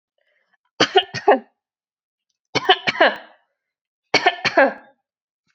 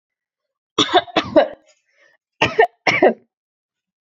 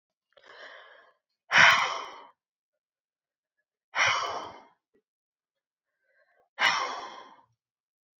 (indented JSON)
{
  "three_cough_length": "5.5 s",
  "three_cough_amplitude": 29758,
  "three_cough_signal_mean_std_ratio": 0.33,
  "cough_length": "4.1 s",
  "cough_amplitude": 32767,
  "cough_signal_mean_std_ratio": 0.35,
  "exhalation_length": "8.2 s",
  "exhalation_amplitude": 19508,
  "exhalation_signal_mean_std_ratio": 0.29,
  "survey_phase": "beta (2021-08-13 to 2022-03-07)",
  "age": "18-44",
  "gender": "Female",
  "wearing_mask": "No",
  "symptom_none": true,
  "smoker_status": "Never smoked",
  "respiratory_condition_asthma": true,
  "respiratory_condition_other": false,
  "recruitment_source": "REACT",
  "submission_delay": "2 days",
  "covid_test_result": "Negative",
  "covid_test_method": "RT-qPCR"
}